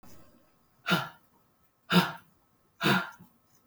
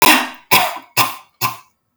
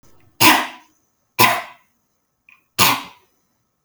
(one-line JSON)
{"exhalation_length": "3.7 s", "exhalation_amplitude": 13405, "exhalation_signal_mean_std_ratio": 0.34, "cough_length": "2.0 s", "cough_amplitude": 32768, "cough_signal_mean_std_ratio": 0.49, "three_cough_length": "3.8 s", "three_cough_amplitude": 32768, "three_cough_signal_mean_std_ratio": 0.33, "survey_phase": "alpha (2021-03-01 to 2021-08-12)", "age": "18-44", "gender": "Female", "wearing_mask": "No", "symptom_none": true, "smoker_status": "Never smoked", "respiratory_condition_asthma": false, "respiratory_condition_other": false, "recruitment_source": "REACT", "submission_delay": "1 day", "covid_test_result": "Negative", "covid_test_method": "RT-qPCR"}